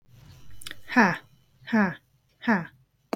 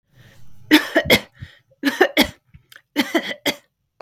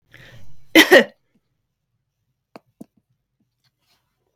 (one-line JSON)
{"exhalation_length": "3.2 s", "exhalation_amplitude": 18169, "exhalation_signal_mean_std_ratio": 0.41, "three_cough_length": "4.0 s", "three_cough_amplitude": 32768, "three_cough_signal_mean_std_ratio": 0.38, "cough_length": "4.4 s", "cough_amplitude": 32768, "cough_signal_mean_std_ratio": 0.21, "survey_phase": "beta (2021-08-13 to 2022-03-07)", "age": "18-44", "gender": "Female", "wearing_mask": "No", "symptom_none": true, "smoker_status": "Never smoked", "respiratory_condition_asthma": false, "respiratory_condition_other": false, "recruitment_source": "REACT", "submission_delay": "2 days", "covid_test_result": "Negative", "covid_test_method": "RT-qPCR", "influenza_a_test_result": "Negative", "influenza_b_test_result": "Negative"}